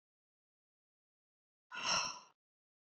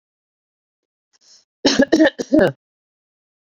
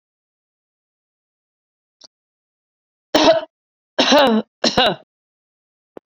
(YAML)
exhalation_length: 2.9 s
exhalation_amplitude: 2767
exhalation_signal_mean_std_ratio: 0.29
cough_length: 3.5 s
cough_amplitude: 29396
cough_signal_mean_std_ratio: 0.33
three_cough_length: 6.1 s
three_cough_amplitude: 27913
three_cough_signal_mean_std_ratio: 0.31
survey_phase: beta (2021-08-13 to 2022-03-07)
age: 45-64
gender: Female
wearing_mask: 'No'
symptom_none: true
smoker_status: Current smoker (e-cigarettes or vapes only)
respiratory_condition_asthma: false
respiratory_condition_other: false
recruitment_source: REACT
submission_delay: 1 day
covid_test_result: Negative
covid_test_method: RT-qPCR